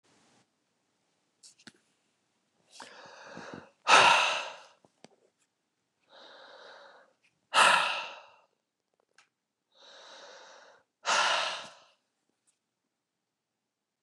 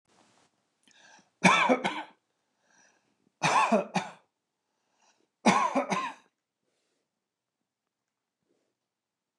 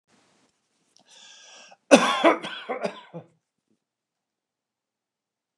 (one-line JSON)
{"exhalation_length": "14.0 s", "exhalation_amplitude": 16784, "exhalation_signal_mean_std_ratio": 0.27, "three_cough_length": "9.4 s", "three_cough_amplitude": 15062, "three_cough_signal_mean_std_ratio": 0.31, "cough_length": "5.6 s", "cough_amplitude": 29204, "cough_signal_mean_std_ratio": 0.24, "survey_phase": "beta (2021-08-13 to 2022-03-07)", "age": "65+", "gender": "Male", "wearing_mask": "No", "symptom_none": true, "smoker_status": "Never smoked", "respiratory_condition_asthma": false, "respiratory_condition_other": false, "recruitment_source": "REACT", "submission_delay": "2 days", "covid_test_result": "Negative", "covid_test_method": "RT-qPCR", "influenza_a_test_result": "Negative", "influenza_b_test_result": "Negative"}